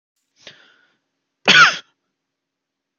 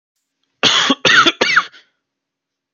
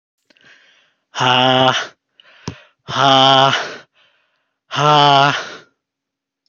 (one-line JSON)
{"cough_length": "3.0 s", "cough_amplitude": 32768, "cough_signal_mean_std_ratio": 0.24, "three_cough_length": "2.7 s", "three_cough_amplitude": 30485, "three_cough_signal_mean_std_ratio": 0.45, "exhalation_length": "6.5 s", "exhalation_amplitude": 31495, "exhalation_signal_mean_std_ratio": 0.45, "survey_phase": "beta (2021-08-13 to 2022-03-07)", "age": "18-44", "gender": "Male", "wearing_mask": "No", "symptom_none": true, "smoker_status": "Never smoked", "respiratory_condition_asthma": false, "respiratory_condition_other": false, "recruitment_source": "REACT", "submission_delay": "3 days", "covid_test_result": "Negative", "covid_test_method": "RT-qPCR", "influenza_a_test_result": "Negative", "influenza_b_test_result": "Negative"}